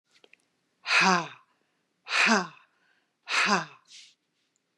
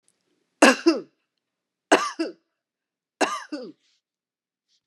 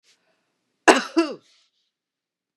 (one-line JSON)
{"exhalation_length": "4.8 s", "exhalation_amplitude": 12291, "exhalation_signal_mean_std_ratio": 0.38, "three_cough_length": "4.9 s", "three_cough_amplitude": 27338, "three_cough_signal_mean_std_ratio": 0.27, "cough_length": "2.6 s", "cough_amplitude": 32767, "cough_signal_mean_std_ratio": 0.23, "survey_phase": "beta (2021-08-13 to 2022-03-07)", "age": "45-64", "gender": "Female", "wearing_mask": "No", "symptom_none": true, "smoker_status": "Ex-smoker", "respiratory_condition_asthma": false, "respiratory_condition_other": false, "recruitment_source": "REACT", "submission_delay": "1 day", "covid_test_result": "Negative", "covid_test_method": "RT-qPCR", "influenza_a_test_result": "Negative", "influenza_b_test_result": "Negative"}